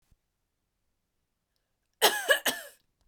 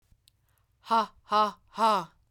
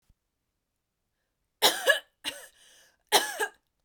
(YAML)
cough_length: 3.1 s
cough_amplitude: 17128
cough_signal_mean_std_ratio: 0.27
exhalation_length: 2.3 s
exhalation_amplitude: 7395
exhalation_signal_mean_std_ratio: 0.44
three_cough_length: 3.8 s
three_cough_amplitude: 15798
three_cough_signal_mean_std_ratio: 0.29
survey_phase: beta (2021-08-13 to 2022-03-07)
age: 45-64
gender: Female
wearing_mask: 'No'
symptom_cough_any: true
symptom_new_continuous_cough: true
symptom_sore_throat: true
symptom_fatigue: true
symptom_headache: true
smoker_status: Never smoked
respiratory_condition_asthma: false
respiratory_condition_other: false
recruitment_source: Test and Trace
submission_delay: 2 days
covid_test_result: Positive
covid_test_method: RT-qPCR
covid_ct_value: 23.8
covid_ct_gene: ORF1ab gene
covid_ct_mean: 24.6
covid_viral_load: 8500 copies/ml
covid_viral_load_category: Minimal viral load (< 10K copies/ml)